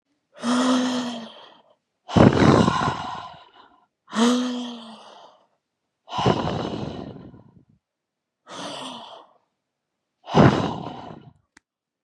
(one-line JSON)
{"exhalation_length": "12.0 s", "exhalation_amplitude": 32767, "exhalation_signal_mean_std_ratio": 0.42, "survey_phase": "beta (2021-08-13 to 2022-03-07)", "age": "18-44", "gender": "Female", "wearing_mask": "No", "symptom_cough_any": true, "symptom_headache": true, "smoker_status": "Never smoked", "respiratory_condition_asthma": false, "respiratory_condition_other": false, "recruitment_source": "Test and Trace", "submission_delay": "2 days", "covid_test_result": "Positive", "covid_test_method": "ePCR"}